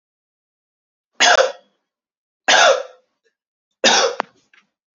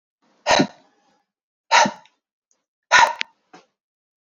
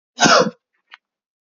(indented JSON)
{
  "three_cough_length": "4.9 s",
  "three_cough_amplitude": 32767,
  "three_cough_signal_mean_std_ratio": 0.35,
  "exhalation_length": "4.3 s",
  "exhalation_amplitude": 32767,
  "exhalation_signal_mean_std_ratio": 0.29,
  "cough_length": "1.5 s",
  "cough_amplitude": 29577,
  "cough_signal_mean_std_ratio": 0.35,
  "survey_phase": "beta (2021-08-13 to 2022-03-07)",
  "age": "18-44",
  "gender": "Male",
  "wearing_mask": "No",
  "symptom_none": true,
  "smoker_status": "Never smoked",
  "respiratory_condition_asthma": false,
  "respiratory_condition_other": false,
  "recruitment_source": "REACT",
  "submission_delay": "1 day",
  "covid_test_result": "Negative",
  "covid_test_method": "RT-qPCR"
}